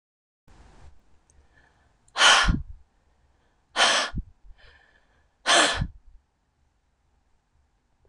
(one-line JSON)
{"exhalation_length": "8.1 s", "exhalation_amplitude": 20814, "exhalation_signal_mean_std_ratio": 0.31, "survey_phase": "beta (2021-08-13 to 2022-03-07)", "age": "65+", "gender": "Female", "wearing_mask": "No", "symptom_cough_any": true, "symptom_runny_or_blocked_nose": true, "symptom_onset": "7 days", "smoker_status": "Ex-smoker", "respiratory_condition_asthma": false, "respiratory_condition_other": false, "recruitment_source": "REACT", "submission_delay": "2 days", "covid_test_result": "Negative", "covid_test_method": "RT-qPCR"}